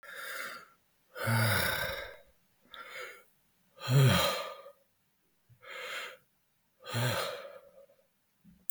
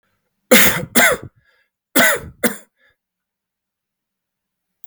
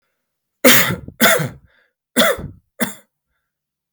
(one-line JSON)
{"exhalation_length": "8.7 s", "exhalation_amplitude": 10017, "exhalation_signal_mean_std_ratio": 0.44, "cough_length": "4.9 s", "cough_amplitude": 32768, "cough_signal_mean_std_ratio": 0.33, "three_cough_length": "3.9 s", "three_cough_amplitude": 32768, "three_cough_signal_mean_std_ratio": 0.38, "survey_phase": "beta (2021-08-13 to 2022-03-07)", "age": "45-64", "gender": "Male", "wearing_mask": "No", "symptom_none": true, "smoker_status": "Never smoked", "respiratory_condition_asthma": false, "respiratory_condition_other": false, "recruitment_source": "REACT", "submission_delay": "0 days", "covid_test_result": "Negative", "covid_test_method": "RT-qPCR", "influenza_a_test_result": "Negative", "influenza_b_test_result": "Negative"}